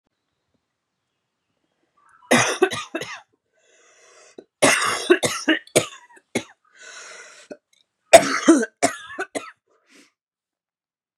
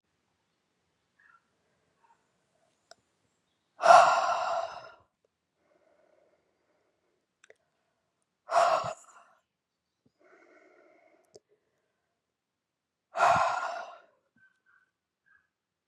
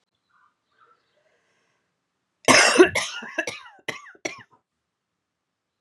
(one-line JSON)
{"three_cough_length": "11.2 s", "three_cough_amplitude": 32768, "three_cough_signal_mean_std_ratio": 0.3, "exhalation_length": "15.9 s", "exhalation_amplitude": 20903, "exhalation_signal_mean_std_ratio": 0.24, "cough_length": "5.8 s", "cough_amplitude": 28102, "cough_signal_mean_std_ratio": 0.26, "survey_phase": "beta (2021-08-13 to 2022-03-07)", "age": "45-64", "gender": "Female", "wearing_mask": "No", "symptom_cough_any": true, "symptom_runny_or_blocked_nose": true, "symptom_sore_throat": true, "symptom_change_to_sense_of_smell_or_taste": true, "symptom_loss_of_taste": true, "symptom_onset": "3 days", "smoker_status": "Ex-smoker", "respiratory_condition_asthma": false, "respiratory_condition_other": false, "recruitment_source": "Test and Trace", "submission_delay": "1 day", "covid_test_result": "Positive", "covid_test_method": "RT-qPCR", "covid_ct_value": 25.1, "covid_ct_gene": "ORF1ab gene"}